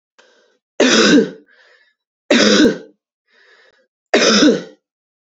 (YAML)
three_cough_length: 5.3 s
three_cough_amplitude: 31974
three_cough_signal_mean_std_ratio: 0.45
survey_phase: beta (2021-08-13 to 2022-03-07)
age: 18-44
gender: Female
wearing_mask: 'No'
symptom_cough_any: true
symptom_new_continuous_cough: true
symptom_runny_or_blocked_nose: true
symptom_sore_throat: true
symptom_fever_high_temperature: true
symptom_headache: true
symptom_change_to_sense_of_smell_or_taste: true
symptom_loss_of_taste: true
symptom_onset: 3 days
smoker_status: Ex-smoker
respiratory_condition_asthma: false
respiratory_condition_other: false
recruitment_source: Test and Trace
submission_delay: 2 days
covid_test_result: Positive
covid_test_method: RT-qPCR
covid_ct_value: 23.0
covid_ct_gene: ORF1ab gene
covid_ct_mean: 23.6
covid_viral_load: 18000 copies/ml
covid_viral_load_category: Low viral load (10K-1M copies/ml)